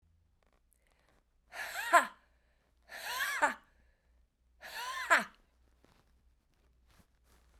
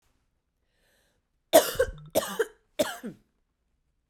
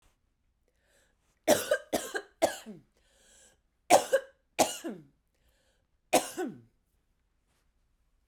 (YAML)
exhalation_length: 7.6 s
exhalation_amplitude: 10031
exhalation_signal_mean_std_ratio: 0.28
cough_length: 4.1 s
cough_amplitude: 22500
cough_signal_mean_std_ratio: 0.27
three_cough_length: 8.3 s
three_cough_amplitude: 13905
three_cough_signal_mean_std_ratio: 0.27
survey_phase: beta (2021-08-13 to 2022-03-07)
age: 45-64
gender: Female
wearing_mask: 'No'
symptom_none: true
smoker_status: Never smoked
respiratory_condition_asthma: false
respiratory_condition_other: false
recruitment_source: REACT
submission_delay: 3 days
covid_test_result: Negative
covid_test_method: RT-qPCR